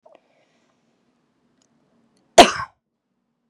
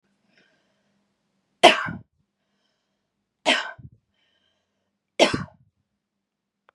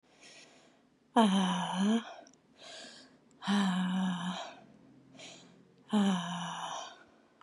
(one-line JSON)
{"cough_length": "3.5 s", "cough_amplitude": 32768, "cough_signal_mean_std_ratio": 0.15, "three_cough_length": "6.7 s", "three_cough_amplitude": 32767, "three_cough_signal_mean_std_ratio": 0.2, "exhalation_length": "7.4 s", "exhalation_amplitude": 8744, "exhalation_signal_mean_std_ratio": 0.55, "survey_phase": "beta (2021-08-13 to 2022-03-07)", "age": "18-44", "gender": "Female", "wearing_mask": "No", "symptom_none": true, "symptom_onset": "7 days", "smoker_status": "Ex-smoker", "respiratory_condition_asthma": false, "respiratory_condition_other": false, "recruitment_source": "REACT", "submission_delay": "5 days", "covid_test_result": "Negative", "covid_test_method": "RT-qPCR", "influenza_a_test_result": "Negative", "influenza_b_test_result": "Negative"}